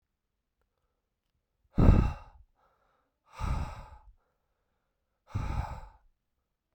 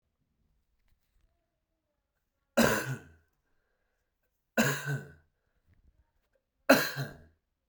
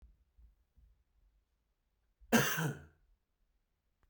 {"exhalation_length": "6.7 s", "exhalation_amplitude": 15245, "exhalation_signal_mean_std_ratio": 0.26, "three_cough_length": "7.7 s", "three_cough_amplitude": 14600, "three_cough_signal_mean_std_ratio": 0.26, "cough_length": "4.1 s", "cough_amplitude": 6400, "cough_signal_mean_std_ratio": 0.26, "survey_phase": "beta (2021-08-13 to 2022-03-07)", "age": "45-64", "gender": "Male", "wearing_mask": "No", "symptom_cough_any": true, "symptom_runny_or_blocked_nose": true, "symptom_headache": true, "symptom_loss_of_taste": true, "symptom_onset": "3 days", "smoker_status": "Never smoked", "respiratory_condition_asthma": false, "respiratory_condition_other": false, "recruitment_source": "Test and Trace", "submission_delay": "2 days", "covid_test_result": "Positive", "covid_test_method": "RT-qPCR", "covid_ct_value": 27.0, "covid_ct_gene": "ORF1ab gene", "covid_ct_mean": 27.6, "covid_viral_load": "890 copies/ml", "covid_viral_load_category": "Minimal viral load (< 10K copies/ml)"}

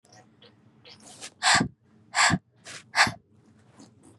{"exhalation_length": "4.2 s", "exhalation_amplitude": 15997, "exhalation_signal_mean_std_ratio": 0.34, "survey_phase": "beta (2021-08-13 to 2022-03-07)", "age": "18-44", "gender": "Female", "wearing_mask": "No", "symptom_headache": true, "smoker_status": "Never smoked", "respiratory_condition_asthma": false, "respiratory_condition_other": false, "recruitment_source": "REACT", "submission_delay": "1 day", "covid_test_result": "Negative", "covid_test_method": "RT-qPCR", "influenza_a_test_result": "Negative", "influenza_b_test_result": "Negative"}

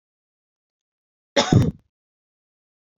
{"cough_length": "3.0 s", "cough_amplitude": 26505, "cough_signal_mean_std_ratio": 0.24, "survey_phase": "beta (2021-08-13 to 2022-03-07)", "age": "18-44", "gender": "Female", "wearing_mask": "No", "symptom_cough_any": true, "symptom_runny_or_blocked_nose": true, "symptom_fatigue": true, "symptom_headache": true, "symptom_onset": "3 days", "smoker_status": "Never smoked", "respiratory_condition_asthma": false, "respiratory_condition_other": false, "recruitment_source": "REACT", "submission_delay": "1 day", "covid_test_result": "Negative", "covid_test_method": "RT-qPCR"}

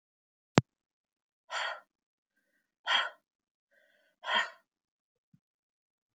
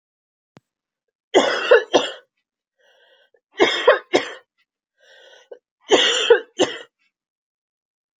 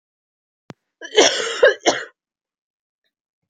{"exhalation_length": "6.1 s", "exhalation_amplitude": 28871, "exhalation_signal_mean_std_ratio": 0.22, "three_cough_length": "8.2 s", "three_cough_amplitude": 30244, "three_cough_signal_mean_std_ratio": 0.33, "cough_length": "3.5 s", "cough_amplitude": 30476, "cough_signal_mean_std_ratio": 0.31, "survey_phase": "beta (2021-08-13 to 2022-03-07)", "age": "18-44", "gender": "Female", "wearing_mask": "No", "symptom_cough_any": true, "symptom_runny_or_blocked_nose": true, "symptom_sore_throat": true, "symptom_fatigue": true, "symptom_other": true, "symptom_onset": "3 days", "smoker_status": "Never smoked", "respiratory_condition_asthma": false, "respiratory_condition_other": false, "recruitment_source": "Test and Trace", "submission_delay": "1 day", "covid_test_result": "Positive", "covid_test_method": "RT-qPCR", "covid_ct_value": 18.4, "covid_ct_gene": "N gene"}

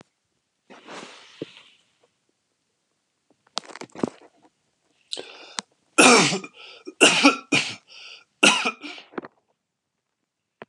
{"three_cough_length": "10.7 s", "three_cough_amplitude": 30385, "three_cough_signal_mean_std_ratio": 0.28, "survey_phase": "alpha (2021-03-01 to 2021-08-12)", "age": "45-64", "gender": "Male", "wearing_mask": "No", "symptom_none": true, "smoker_status": "Ex-smoker", "respiratory_condition_asthma": false, "respiratory_condition_other": false, "recruitment_source": "REACT", "submission_delay": "1 day", "covid_test_result": "Negative", "covid_test_method": "RT-qPCR"}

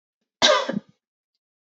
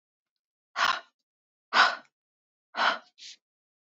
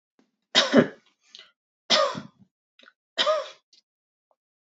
{"cough_length": "1.8 s", "cough_amplitude": 27593, "cough_signal_mean_std_ratio": 0.32, "exhalation_length": "3.9 s", "exhalation_amplitude": 15983, "exhalation_signal_mean_std_ratio": 0.3, "three_cough_length": "4.8 s", "three_cough_amplitude": 19960, "three_cough_signal_mean_std_ratio": 0.31, "survey_phase": "beta (2021-08-13 to 2022-03-07)", "age": "18-44", "gender": "Female", "wearing_mask": "No", "symptom_none": true, "smoker_status": "Never smoked", "respiratory_condition_asthma": false, "respiratory_condition_other": false, "recruitment_source": "REACT", "submission_delay": "1 day", "covid_test_result": "Negative", "covid_test_method": "RT-qPCR", "influenza_a_test_result": "Negative", "influenza_b_test_result": "Negative"}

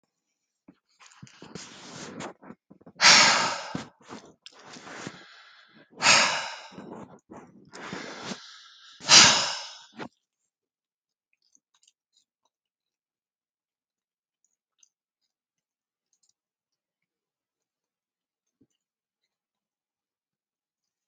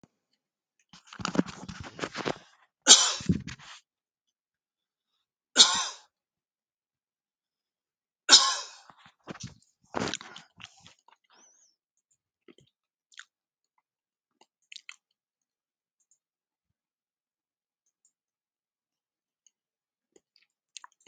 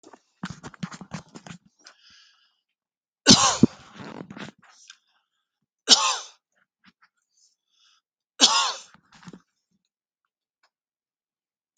{"exhalation_length": "21.1 s", "exhalation_amplitude": 28692, "exhalation_signal_mean_std_ratio": 0.23, "cough_length": "21.1 s", "cough_amplitude": 29746, "cough_signal_mean_std_ratio": 0.17, "three_cough_length": "11.8 s", "three_cough_amplitude": 32768, "three_cough_signal_mean_std_ratio": 0.22, "survey_phase": "alpha (2021-03-01 to 2021-08-12)", "age": "65+", "gender": "Male", "wearing_mask": "No", "symptom_none": true, "smoker_status": "Never smoked", "respiratory_condition_asthma": false, "respiratory_condition_other": false, "recruitment_source": "REACT", "submission_delay": "3 days", "covid_test_result": "Negative", "covid_test_method": "RT-qPCR"}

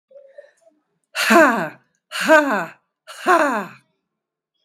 {"exhalation_length": "4.6 s", "exhalation_amplitude": 32768, "exhalation_signal_mean_std_ratio": 0.4, "survey_phase": "beta (2021-08-13 to 2022-03-07)", "age": "65+", "gender": "Female", "wearing_mask": "No", "symptom_cough_any": true, "symptom_runny_or_blocked_nose": true, "symptom_shortness_of_breath": true, "symptom_onset": "13 days", "smoker_status": "Ex-smoker", "respiratory_condition_asthma": true, "respiratory_condition_other": false, "recruitment_source": "REACT", "submission_delay": "2 days", "covid_test_result": "Negative", "covid_test_method": "RT-qPCR", "influenza_a_test_result": "Negative", "influenza_b_test_result": "Negative"}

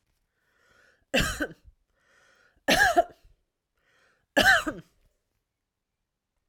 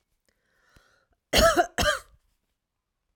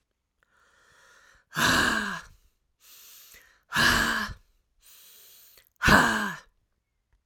{"three_cough_length": "6.5 s", "three_cough_amplitude": 16258, "three_cough_signal_mean_std_ratio": 0.3, "cough_length": "3.2 s", "cough_amplitude": 14344, "cough_signal_mean_std_ratio": 0.32, "exhalation_length": "7.3 s", "exhalation_amplitude": 19308, "exhalation_signal_mean_std_ratio": 0.39, "survey_phase": "alpha (2021-03-01 to 2021-08-12)", "age": "45-64", "gender": "Female", "wearing_mask": "No", "symptom_none": true, "smoker_status": "Ex-smoker", "respiratory_condition_asthma": false, "respiratory_condition_other": false, "recruitment_source": "REACT", "submission_delay": "2 days", "covid_test_result": "Negative", "covid_test_method": "RT-qPCR"}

